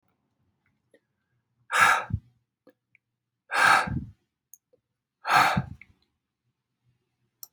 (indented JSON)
{
  "exhalation_length": "7.5 s",
  "exhalation_amplitude": 15948,
  "exhalation_signal_mean_std_ratio": 0.31,
  "survey_phase": "beta (2021-08-13 to 2022-03-07)",
  "age": "45-64",
  "gender": "Male",
  "wearing_mask": "No",
  "symptom_none": true,
  "smoker_status": "Ex-smoker",
  "respiratory_condition_asthma": false,
  "respiratory_condition_other": false,
  "recruitment_source": "REACT",
  "submission_delay": "19 days",
  "covid_test_result": "Negative",
  "covid_test_method": "RT-qPCR"
}